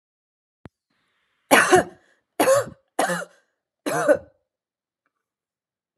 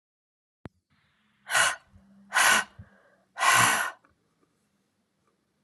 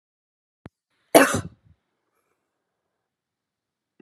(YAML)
three_cough_length: 6.0 s
three_cough_amplitude: 31886
three_cough_signal_mean_std_ratio: 0.32
exhalation_length: 5.6 s
exhalation_amplitude: 12883
exhalation_signal_mean_std_ratio: 0.35
cough_length: 4.0 s
cough_amplitude: 32537
cough_signal_mean_std_ratio: 0.17
survey_phase: beta (2021-08-13 to 2022-03-07)
age: 45-64
gender: Female
wearing_mask: 'No'
symptom_none: true
smoker_status: Never smoked
respiratory_condition_asthma: false
respiratory_condition_other: false
recruitment_source: REACT
submission_delay: 3 days
covid_test_result: Negative
covid_test_method: RT-qPCR